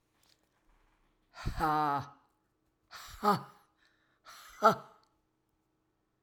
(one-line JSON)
{"exhalation_length": "6.2 s", "exhalation_amplitude": 10358, "exhalation_signal_mean_std_ratio": 0.3, "survey_phase": "alpha (2021-03-01 to 2021-08-12)", "age": "65+", "gender": "Female", "wearing_mask": "No", "symptom_cough_any": true, "symptom_onset": "3 days", "smoker_status": "Never smoked", "respiratory_condition_asthma": false, "respiratory_condition_other": false, "recruitment_source": "Test and Trace", "submission_delay": "2 days", "covid_test_result": "Positive", "covid_test_method": "RT-qPCR", "covid_ct_value": 23.3, "covid_ct_gene": "N gene", "covid_ct_mean": 23.4, "covid_viral_load": "21000 copies/ml", "covid_viral_load_category": "Low viral load (10K-1M copies/ml)"}